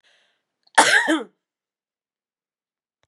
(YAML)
cough_length: 3.1 s
cough_amplitude: 32195
cough_signal_mean_std_ratio: 0.28
survey_phase: beta (2021-08-13 to 2022-03-07)
age: 45-64
gender: Female
wearing_mask: 'No'
symptom_cough_any: true
symptom_onset: 30 days
smoker_status: Never smoked
respiratory_condition_asthma: false
respiratory_condition_other: false
recruitment_source: Test and Trace
submission_delay: 1 day
covid_test_result: Negative
covid_test_method: RT-qPCR